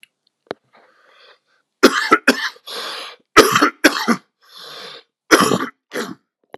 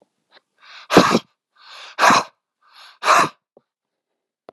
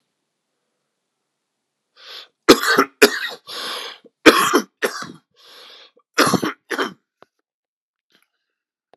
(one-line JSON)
{"cough_length": "6.6 s", "cough_amplitude": 32768, "cough_signal_mean_std_ratio": 0.36, "exhalation_length": "4.5 s", "exhalation_amplitude": 32768, "exhalation_signal_mean_std_ratio": 0.33, "three_cough_length": "9.0 s", "three_cough_amplitude": 32768, "three_cough_signal_mean_std_ratio": 0.29, "survey_phase": "beta (2021-08-13 to 2022-03-07)", "age": "18-44", "gender": "Male", "wearing_mask": "No", "symptom_cough_any": true, "symptom_runny_or_blocked_nose": true, "symptom_shortness_of_breath": true, "symptom_sore_throat": true, "symptom_fatigue": true, "symptom_headache": true, "symptom_onset": "6 days", "smoker_status": "Ex-smoker", "respiratory_condition_asthma": false, "respiratory_condition_other": false, "recruitment_source": "Test and Trace", "submission_delay": "2 days", "covid_test_result": "Positive", "covid_test_method": "RT-qPCR", "covid_ct_value": 21.6, "covid_ct_gene": "ORF1ab gene", "covid_ct_mean": 22.0, "covid_viral_load": "62000 copies/ml", "covid_viral_load_category": "Low viral load (10K-1M copies/ml)"}